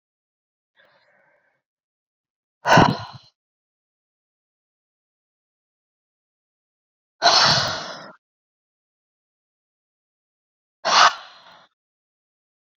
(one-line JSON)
{"exhalation_length": "12.8 s", "exhalation_amplitude": 28101, "exhalation_signal_mean_std_ratio": 0.23, "survey_phase": "beta (2021-08-13 to 2022-03-07)", "age": "18-44", "gender": "Female", "wearing_mask": "No", "symptom_cough_any": true, "symptom_runny_or_blocked_nose": true, "symptom_sore_throat": true, "symptom_fatigue": true, "symptom_headache": true, "symptom_change_to_sense_of_smell_or_taste": true, "smoker_status": "Ex-smoker", "respiratory_condition_asthma": false, "respiratory_condition_other": false, "recruitment_source": "Test and Trace", "submission_delay": "2 days", "covid_test_result": "Positive", "covid_test_method": "LFT"}